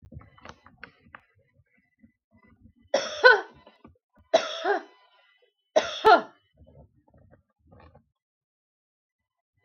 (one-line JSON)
{"three_cough_length": "9.6 s", "three_cough_amplitude": 30387, "three_cough_signal_mean_std_ratio": 0.23, "survey_phase": "beta (2021-08-13 to 2022-03-07)", "age": "45-64", "gender": "Female", "wearing_mask": "No", "symptom_none": true, "smoker_status": "Ex-smoker", "respiratory_condition_asthma": false, "respiratory_condition_other": false, "recruitment_source": "REACT", "submission_delay": "1 day", "covid_test_result": "Negative", "covid_test_method": "RT-qPCR", "influenza_a_test_result": "Unknown/Void", "influenza_b_test_result": "Unknown/Void"}